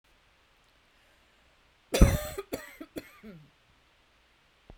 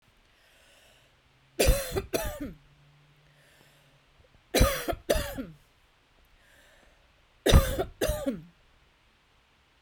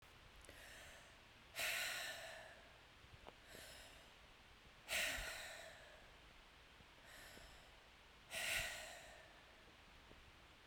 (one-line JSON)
{"cough_length": "4.8 s", "cough_amplitude": 21663, "cough_signal_mean_std_ratio": 0.2, "three_cough_length": "9.8 s", "three_cough_amplitude": 19590, "three_cough_signal_mean_std_ratio": 0.33, "exhalation_length": "10.7 s", "exhalation_amplitude": 1043, "exhalation_signal_mean_std_ratio": 0.59, "survey_phase": "beta (2021-08-13 to 2022-03-07)", "age": "45-64", "gender": "Female", "wearing_mask": "No", "symptom_none": true, "smoker_status": "Never smoked", "respiratory_condition_asthma": false, "respiratory_condition_other": false, "recruitment_source": "REACT", "submission_delay": "2 days", "covid_test_result": "Negative", "covid_test_method": "RT-qPCR"}